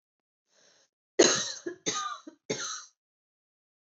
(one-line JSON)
{"three_cough_length": "3.8 s", "three_cough_amplitude": 15409, "three_cough_signal_mean_std_ratio": 0.32, "survey_phase": "beta (2021-08-13 to 2022-03-07)", "age": "18-44", "gender": "Female", "wearing_mask": "No", "symptom_cough_any": true, "symptom_runny_or_blocked_nose": true, "symptom_sore_throat": true, "symptom_onset": "3 days", "smoker_status": "Never smoked", "respiratory_condition_asthma": false, "respiratory_condition_other": false, "recruitment_source": "Test and Trace", "submission_delay": "1 day", "covid_test_result": "Positive", "covid_test_method": "RT-qPCR", "covid_ct_value": 21.2, "covid_ct_gene": "ORF1ab gene", "covid_ct_mean": 21.4, "covid_viral_load": "92000 copies/ml", "covid_viral_load_category": "Low viral load (10K-1M copies/ml)"}